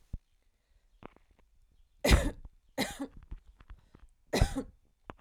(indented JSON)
{
  "three_cough_length": "5.2 s",
  "three_cough_amplitude": 12194,
  "three_cough_signal_mean_std_ratio": 0.29,
  "survey_phase": "alpha (2021-03-01 to 2021-08-12)",
  "age": "18-44",
  "gender": "Female",
  "wearing_mask": "No",
  "symptom_none": true,
  "smoker_status": "Ex-smoker",
  "respiratory_condition_asthma": false,
  "respiratory_condition_other": false,
  "recruitment_source": "REACT",
  "submission_delay": "1 day",
  "covid_test_result": "Negative",
  "covid_test_method": "RT-qPCR"
}